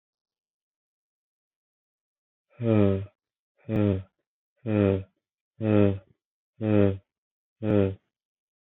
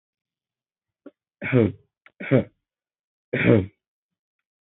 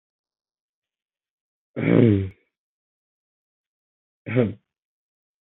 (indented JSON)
{
  "exhalation_length": "8.6 s",
  "exhalation_amplitude": 13065,
  "exhalation_signal_mean_std_ratio": 0.34,
  "three_cough_length": "4.8 s",
  "three_cough_amplitude": 23486,
  "three_cough_signal_mean_std_ratio": 0.28,
  "cough_length": "5.5 s",
  "cough_amplitude": 22941,
  "cough_signal_mean_std_ratio": 0.25,
  "survey_phase": "beta (2021-08-13 to 2022-03-07)",
  "age": "18-44",
  "gender": "Male",
  "wearing_mask": "No",
  "symptom_sore_throat": true,
  "symptom_fatigue": true,
  "symptom_change_to_sense_of_smell_or_taste": true,
  "symptom_onset": "2 days",
  "smoker_status": "Current smoker (1 to 10 cigarettes per day)",
  "respiratory_condition_asthma": false,
  "respiratory_condition_other": false,
  "recruitment_source": "Test and Trace",
  "submission_delay": "0 days",
  "covid_test_result": "Positive",
  "covid_test_method": "ePCR"
}